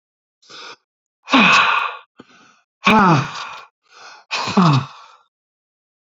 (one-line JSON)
{"exhalation_length": "6.1 s", "exhalation_amplitude": 29559, "exhalation_signal_mean_std_ratio": 0.42, "survey_phase": "beta (2021-08-13 to 2022-03-07)", "age": "18-44", "gender": "Male", "wearing_mask": "No", "symptom_cough_any": true, "symptom_runny_or_blocked_nose": true, "symptom_fatigue": true, "symptom_headache": true, "smoker_status": "Current smoker (11 or more cigarettes per day)", "respiratory_condition_asthma": false, "respiratory_condition_other": false, "recruitment_source": "REACT", "submission_delay": "1 day", "covid_test_result": "Negative", "covid_test_method": "RT-qPCR", "influenza_a_test_result": "Negative", "influenza_b_test_result": "Negative"}